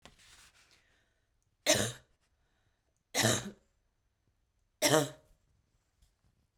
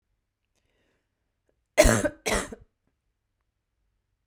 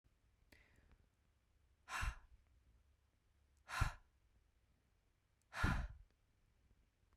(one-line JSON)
{"three_cough_length": "6.6 s", "three_cough_amplitude": 9151, "three_cough_signal_mean_std_ratio": 0.27, "cough_length": "4.3 s", "cough_amplitude": 27837, "cough_signal_mean_std_ratio": 0.23, "exhalation_length": "7.2 s", "exhalation_amplitude": 2136, "exhalation_signal_mean_std_ratio": 0.29, "survey_phase": "beta (2021-08-13 to 2022-03-07)", "age": "18-44", "gender": "Female", "wearing_mask": "No", "symptom_cough_any": true, "symptom_runny_or_blocked_nose": true, "symptom_sore_throat": true, "symptom_fatigue": true, "symptom_fever_high_temperature": true, "symptom_headache": true, "symptom_onset": "2 days", "smoker_status": "Never smoked", "respiratory_condition_asthma": false, "respiratory_condition_other": false, "recruitment_source": "Test and Trace", "submission_delay": "2 days", "covid_test_result": "Positive", "covid_test_method": "RT-qPCR", "covid_ct_value": 35.1, "covid_ct_gene": "N gene"}